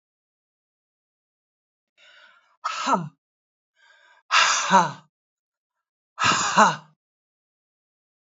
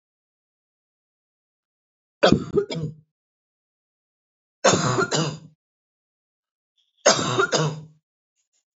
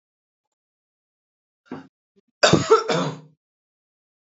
{"exhalation_length": "8.4 s", "exhalation_amplitude": 25389, "exhalation_signal_mean_std_ratio": 0.31, "three_cough_length": "8.8 s", "three_cough_amplitude": 26441, "three_cough_signal_mean_std_ratio": 0.33, "cough_length": "4.3 s", "cough_amplitude": 26243, "cough_signal_mean_std_ratio": 0.27, "survey_phase": "alpha (2021-03-01 to 2021-08-12)", "age": "45-64", "gender": "Female", "wearing_mask": "No", "symptom_none": true, "smoker_status": "Ex-smoker", "respiratory_condition_asthma": false, "respiratory_condition_other": false, "recruitment_source": "REACT", "submission_delay": "6 days", "covid_test_result": "Negative", "covid_test_method": "RT-qPCR"}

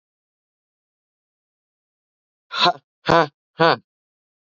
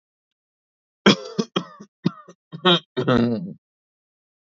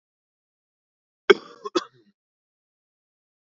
{"exhalation_length": "4.4 s", "exhalation_amplitude": 28891, "exhalation_signal_mean_std_ratio": 0.24, "three_cough_length": "4.5 s", "three_cough_amplitude": 26835, "three_cough_signal_mean_std_ratio": 0.35, "cough_length": "3.6 s", "cough_amplitude": 29571, "cough_signal_mean_std_ratio": 0.12, "survey_phase": "beta (2021-08-13 to 2022-03-07)", "age": "18-44", "gender": "Male", "wearing_mask": "No", "symptom_none": true, "smoker_status": "Ex-smoker", "respiratory_condition_asthma": false, "respiratory_condition_other": false, "recruitment_source": "REACT", "submission_delay": "3 days", "covid_test_result": "Negative", "covid_test_method": "RT-qPCR", "influenza_a_test_result": "Negative", "influenza_b_test_result": "Negative"}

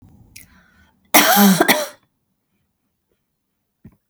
{"cough_length": "4.1 s", "cough_amplitude": 32768, "cough_signal_mean_std_ratio": 0.33, "survey_phase": "beta (2021-08-13 to 2022-03-07)", "age": "45-64", "gender": "Female", "wearing_mask": "No", "symptom_runny_or_blocked_nose": true, "symptom_sore_throat": true, "smoker_status": "Never smoked", "respiratory_condition_asthma": false, "respiratory_condition_other": false, "recruitment_source": "REACT", "submission_delay": "1 day", "covid_test_result": "Negative", "covid_test_method": "RT-qPCR", "influenza_a_test_result": "Negative", "influenza_b_test_result": "Negative"}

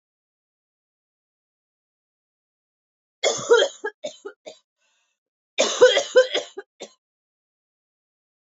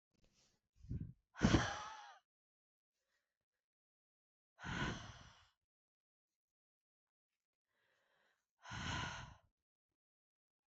{"cough_length": "8.4 s", "cough_amplitude": 23679, "cough_signal_mean_std_ratio": 0.27, "exhalation_length": "10.7 s", "exhalation_amplitude": 3536, "exhalation_signal_mean_std_ratio": 0.26, "survey_phase": "alpha (2021-03-01 to 2021-08-12)", "age": "18-44", "gender": "Female", "wearing_mask": "Prefer not to say", "symptom_cough_any": true, "symptom_fatigue": true, "symptom_change_to_sense_of_smell_or_taste": true, "symptom_loss_of_taste": true, "symptom_onset": "6 days", "smoker_status": "Current smoker (1 to 10 cigarettes per day)", "respiratory_condition_asthma": false, "respiratory_condition_other": false, "recruitment_source": "Test and Trace", "submission_delay": "3 days", "covid_test_result": "Positive", "covid_test_method": "ePCR"}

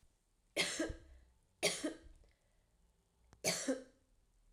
{"three_cough_length": "4.5 s", "three_cough_amplitude": 3191, "three_cough_signal_mean_std_ratio": 0.39, "survey_phase": "alpha (2021-03-01 to 2021-08-12)", "age": "18-44", "gender": "Female", "wearing_mask": "No", "symptom_prefer_not_to_say": true, "symptom_onset": "3 days", "smoker_status": "Never smoked", "respiratory_condition_asthma": false, "respiratory_condition_other": false, "recruitment_source": "Test and Trace", "submission_delay": "2 days", "covid_test_result": "Positive", "covid_test_method": "RT-qPCR", "covid_ct_value": 20.3, "covid_ct_gene": "ORF1ab gene", "covid_ct_mean": 21.1, "covid_viral_load": "120000 copies/ml", "covid_viral_load_category": "Low viral load (10K-1M copies/ml)"}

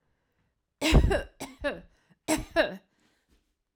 {"three_cough_length": "3.8 s", "three_cough_amplitude": 14521, "three_cough_signal_mean_std_ratio": 0.36, "survey_phase": "alpha (2021-03-01 to 2021-08-12)", "age": "45-64", "gender": "Female", "wearing_mask": "No", "symptom_none": true, "smoker_status": "Never smoked", "respiratory_condition_asthma": false, "respiratory_condition_other": false, "recruitment_source": "REACT", "submission_delay": "2 days", "covid_test_result": "Negative", "covid_test_method": "RT-qPCR"}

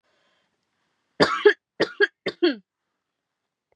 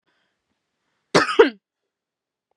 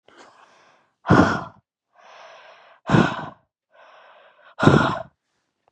{"three_cough_length": "3.8 s", "three_cough_amplitude": 21947, "three_cough_signal_mean_std_ratio": 0.28, "cough_length": "2.6 s", "cough_amplitude": 32314, "cough_signal_mean_std_ratio": 0.23, "exhalation_length": "5.7 s", "exhalation_amplitude": 32767, "exhalation_signal_mean_std_ratio": 0.32, "survey_phase": "beta (2021-08-13 to 2022-03-07)", "age": "18-44", "gender": "Female", "wearing_mask": "No", "symptom_none": true, "symptom_onset": "10 days", "smoker_status": "Never smoked", "respiratory_condition_asthma": false, "respiratory_condition_other": false, "recruitment_source": "REACT", "submission_delay": "4 days", "covid_test_result": "Negative", "covid_test_method": "RT-qPCR", "influenza_a_test_result": "Negative", "influenza_b_test_result": "Negative"}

